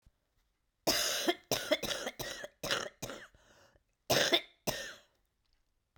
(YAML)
cough_length: 6.0 s
cough_amplitude: 7825
cough_signal_mean_std_ratio: 0.43
survey_phase: beta (2021-08-13 to 2022-03-07)
age: 65+
gender: Female
wearing_mask: 'No'
symptom_cough_any: true
symptom_new_continuous_cough: true
symptom_runny_or_blocked_nose: true
symptom_sore_throat: true
symptom_fatigue: true
symptom_headache: true
smoker_status: Never smoked
respiratory_condition_asthma: false
respiratory_condition_other: false
recruitment_source: Test and Trace
submission_delay: 0 days
covid_test_result: Positive
covid_test_method: LFT